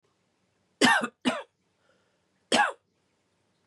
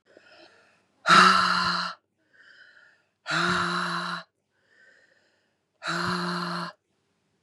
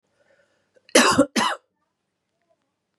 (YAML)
three_cough_length: 3.7 s
three_cough_amplitude: 13956
three_cough_signal_mean_std_ratio: 0.31
exhalation_length: 7.4 s
exhalation_amplitude: 21667
exhalation_signal_mean_std_ratio: 0.43
cough_length: 3.0 s
cough_amplitude: 28428
cough_signal_mean_std_ratio: 0.3
survey_phase: beta (2021-08-13 to 2022-03-07)
age: 18-44
gender: Female
wearing_mask: 'No'
symptom_cough_any: true
symptom_new_continuous_cough: true
symptom_runny_or_blocked_nose: true
symptom_fatigue: true
symptom_headache: true
symptom_change_to_sense_of_smell_or_taste: true
smoker_status: Ex-smoker
respiratory_condition_asthma: false
respiratory_condition_other: false
recruitment_source: Test and Trace
submission_delay: 2 days
covid_test_result: Positive
covid_test_method: LFT